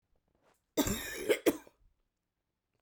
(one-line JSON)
{"cough_length": "2.8 s", "cough_amplitude": 6410, "cough_signal_mean_std_ratio": 0.33, "survey_phase": "beta (2021-08-13 to 2022-03-07)", "age": "45-64", "gender": "Female", "wearing_mask": "No", "symptom_cough_any": true, "symptom_new_continuous_cough": true, "symptom_runny_or_blocked_nose": true, "symptom_sore_throat": true, "symptom_fatigue": true, "symptom_headache": true, "symptom_change_to_sense_of_smell_or_taste": true, "symptom_onset": "4 days", "smoker_status": "Never smoked", "respiratory_condition_asthma": true, "respiratory_condition_other": false, "recruitment_source": "Test and Trace", "submission_delay": "3 days", "covid_test_result": "Positive", "covid_test_method": "RT-qPCR", "covid_ct_value": 18.6, "covid_ct_gene": "ORF1ab gene", "covid_ct_mean": 19.1, "covid_viral_load": "560000 copies/ml", "covid_viral_load_category": "Low viral load (10K-1M copies/ml)"}